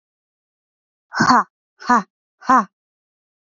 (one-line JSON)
{"exhalation_length": "3.5 s", "exhalation_amplitude": 30205, "exhalation_signal_mean_std_ratio": 0.3, "survey_phase": "beta (2021-08-13 to 2022-03-07)", "age": "18-44", "gender": "Female", "wearing_mask": "No", "symptom_runny_or_blocked_nose": true, "symptom_sore_throat": true, "symptom_fatigue": true, "symptom_change_to_sense_of_smell_or_taste": true, "symptom_other": true, "smoker_status": "Never smoked", "respiratory_condition_asthma": false, "respiratory_condition_other": false, "recruitment_source": "Test and Trace", "submission_delay": "2 days", "covid_test_result": "Positive", "covid_test_method": "RT-qPCR", "covid_ct_value": 22.2, "covid_ct_gene": "ORF1ab gene", "covid_ct_mean": 23.0, "covid_viral_load": "28000 copies/ml", "covid_viral_load_category": "Low viral load (10K-1M copies/ml)"}